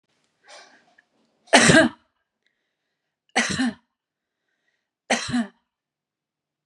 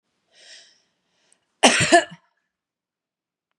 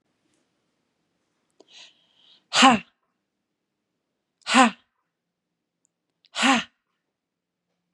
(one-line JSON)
{"three_cough_length": "6.7 s", "three_cough_amplitude": 30748, "three_cough_signal_mean_std_ratio": 0.28, "cough_length": "3.6 s", "cough_amplitude": 32554, "cough_signal_mean_std_ratio": 0.25, "exhalation_length": "7.9 s", "exhalation_amplitude": 27871, "exhalation_signal_mean_std_ratio": 0.23, "survey_phase": "beta (2021-08-13 to 2022-03-07)", "age": "18-44", "gender": "Female", "wearing_mask": "No", "symptom_none": true, "smoker_status": "Never smoked", "respiratory_condition_asthma": false, "respiratory_condition_other": false, "recruitment_source": "REACT", "submission_delay": "2 days", "covid_test_result": "Negative", "covid_test_method": "RT-qPCR", "influenza_a_test_result": "Negative", "influenza_b_test_result": "Negative"}